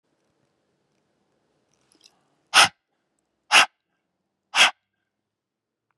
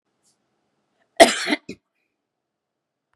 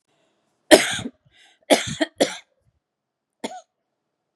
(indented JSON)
{
  "exhalation_length": "6.0 s",
  "exhalation_amplitude": 29432,
  "exhalation_signal_mean_std_ratio": 0.2,
  "cough_length": "3.2 s",
  "cough_amplitude": 32768,
  "cough_signal_mean_std_ratio": 0.19,
  "three_cough_length": "4.4 s",
  "three_cough_amplitude": 32768,
  "three_cough_signal_mean_std_ratio": 0.25,
  "survey_phase": "beta (2021-08-13 to 2022-03-07)",
  "age": "45-64",
  "gender": "Female",
  "wearing_mask": "No",
  "symptom_runny_or_blocked_nose": true,
  "smoker_status": "Never smoked",
  "respiratory_condition_asthma": false,
  "respiratory_condition_other": false,
  "recruitment_source": "REACT",
  "submission_delay": "1 day",
  "covid_test_result": "Negative",
  "covid_test_method": "RT-qPCR",
  "influenza_a_test_result": "Unknown/Void",
  "influenza_b_test_result": "Unknown/Void"
}